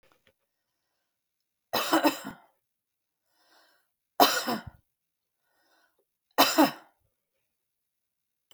three_cough_length: 8.5 s
three_cough_amplitude: 25523
three_cough_signal_mean_std_ratio: 0.25
survey_phase: beta (2021-08-13 to 2022-03-07)
age: 45-64
gender: Female
wearing_mask: 'No'
symptom_none: true
smoker_status: Never smoked
respiratory_condition_asthma: false
respiratory_condition_other: false
recruitment_source: REACT
submission_delay: 2 days
covid_test_result: Negative
covid_test_method: RT-qPCR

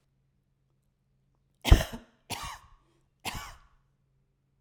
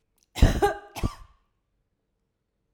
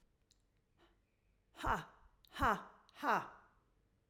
three_cough_length: 4.6 s
three_cough_amplitude: 21535
three_cough_signal_mean_std_ratio: 0.17
cough_length: 2.7 s
cough_amplitude: 19254
cough_signal_mean_std_ratio: 0.28
exhalation_length: 4.1 s
exhalation_amplitude: 2838
exhalation_signal_mean_std_ratio: 0.32
survey_phase: alpha (2021-03-01 to 2021-08-12)
age: 65+
gender: Female
wearing_mask: 'No'
symptom_cough_any: true
smoker_status: Never smoked
respiratory_condition_asthma: false
respiratory_condition_other: false
recruitment_source: REACT
submission_delay: 3 days
covid_test_result: Negative
covid_test_method: RT-qPCR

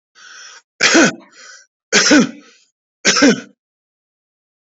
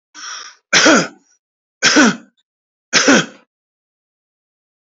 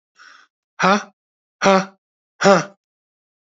three_cough_length: 4.7 s
three_cough_amplitude: 31973
three_cough_signal_mean_std_ratio: 0.39
cough_length: 4.9 s
cough_amplitude: 32768
cough_signal_mean_std_ratio: 0.38
exhalation_length: 3.6 s
exhalation_amplitude: 28718
exhalation_signal_mean_std_ratio: 0.31
survey_phase: beta (2021-08-13 to 2022-03-07)
age: 45-64
gender: Male
wearing_mask: 'No'
symptom_none: true
smoker_status: Never smoked
respiratory_condition_asthma: true
respiratory_condition_other: false
recruitment_source: REACT
submission_delay: 1 day
covid_test_result: Negative
covid_test_method: RT-qPCR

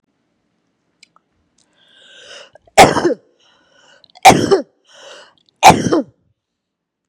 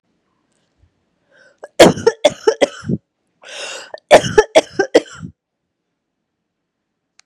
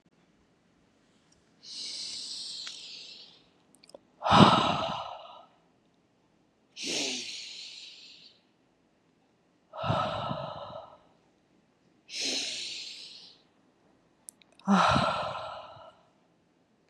three_cough_length: 7.1 s
three_cough_amplitude: 32768
three_cough_signal_mean_std_ratio: 0.28
cough_length: 7.3 s
cough_amplitude: 32768
cough_signal_mean_std_ratio: 0.28
exhalation_length: 16.9 s
exhalation_amplitude: 25832
exhalation_signal_mean_std_ratio: 0.36
survey_phase: beta (2021-08-13 to 2022-03-07)
age: 45-64
gender: Female
wearing_mask: 'No'
symptom_none: true
smoker_status: Ex-smoker
respiratory_condition_asthma: false
respiratory_condition_other: false
recruitment_source: REACT
submission_delay: 1 day
covid_test_result: Negative
covid_test_method: RT-qPCR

